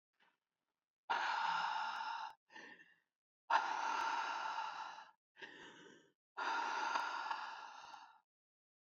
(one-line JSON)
{"exhalation_length": "8.9 s", "exhalation_amplitude": 3381, "exhalation_signal_mean_std_ratio": 0.6, "survey_phase": "beta (2021-08-13 to 2022-03-07)", "age": "18-44", "gender": "Female", "wearing_mask": "No", "symptom_cough_any": true, "symptom_runny_or_blocked_nose": true, "symptom_shortness_of_breath": true, "symptom_sore_throat": true, "symptom_fatigue": true, "symptom_headache": true, "symptom_onset": "6 days", "smoker_status": "Ex-smoker", "respiratory_condition_asthma": false, "respiratory_condition_other": false, "recruitment_source": "Test and Trace", "submission_delay": "1 day", "covid_test_result": "Positive", "covid_test_method": "RT-qPCR", "covid_ct_value": 21.6, "covid_ct_gene": "ORF1ab gene"}